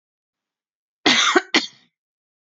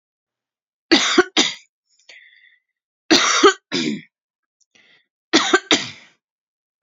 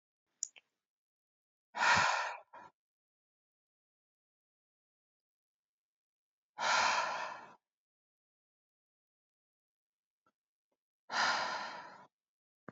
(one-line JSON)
{"cough_length": "2.5 s", "cough_amplitude": 30085, "cough_signal_mean_std_ratio": 0.33, "three_cough_length": "6.8 s", "three_cough_amplitude": 32474, "three_cough_signal_mean_std_ratio": 0.35, "exhalation_length": "12.7 s", "exhalation_amplitude": 5082, "exhalation_signal_mean_std_ratio": 0.3, "survey_phase": "beta (2021-08-13 to 2022-03-07)", "age": "18-44", "gender": "Female", "wearing_mask": "No", "symptom_cough_any": true, "symptom_fatigue": true, "symptom_onset": "13 days", "smoker_status": "Current smoker (1 to 10 cigarettes per day)", "respiratory_condition_asthma": false, "respiratory_condition_other": false, "recruitment_source": "REACT", "submission_delay": "1 day", "covid_test_result": "Negative", "covid_test_method": "RT-qPCR", "influenza_a_test_result": "Negative", "influenza_b_test_result": "Negative"}